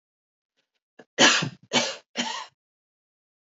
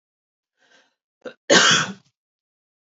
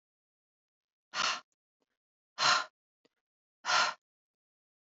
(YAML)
three_cough_length: 3.4 s
three_cough_amplitude: 23574
three_cough_signal_mean_std_ratio: 0.32
cough_length: 2.8 s
cough_amplitude: 26309
cough_signal_mean_std_ratio: 0.3
exhalation_length: 4.9 s
exhalation_amplitude: 7357
exhalation_signal_mean_std_ratio: 0.3
survey_phase: beta (2021-08-13 to 2022-03-07)
age: 18-44
gender: Female
wearing_mask: 'No'
symptom_runny_or_blocked_nose: true
smoker_status: Never smoked
respiratory_condition_asthma: false
respiratory_condition_other: false
recruitment_source: REACT
submission_delay: 2 days
covid_test_result: Negative
covid_test_method: RT-qPCR
influenza_a_test_result: Negative
influenza_b_test_result: Negative